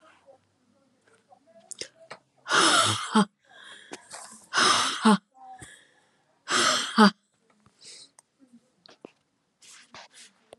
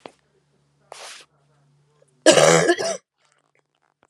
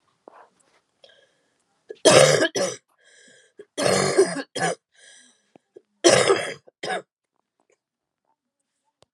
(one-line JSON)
{"exhalation_length": "10.6 s", "exhalation_amplitude": 20495, "exhalation_signal_mean_std_ratio": 0.34, "cough_length": "4.1 s", "cough_amplitude": 32537, "cough_signal_mean_std_ratio": 0.3, "three_cough_length": "9.1 s", "three_cough_amplitude": 32190, "three_cough_signal_mean_std_ratio": 0.34, "survey_phase": "beta (2021-08-13 to 2022-03-07)", "age": "45-64", "gender": "Female", "wearing_mask": "No", "symptom_cough_any": true, "symptom_runny_or_blocked_nose": true, "symptom_sore_throat": true, "symptom_fatigue": true, "symptom_headache": true, "symptom_other": true, "smoker_status": "Ex-smoker", "respiratory_condition_asthma": true, "respiratory_condition_other": false, "recruitment_source": "Test and Trace", "submission_delay": "2 days", "covid_test_result": "Positive", "covid_test_method": "RT-qPCR", "covid_ct_value": 21.2, "covid_ct_gene": "ORF1ab gene", "covid_ct_mean": 22.2, "covid_viral_load": "52000 copies/ml", "covid_viral_load_category": "Low viral load (10K-1M copies/ml)"}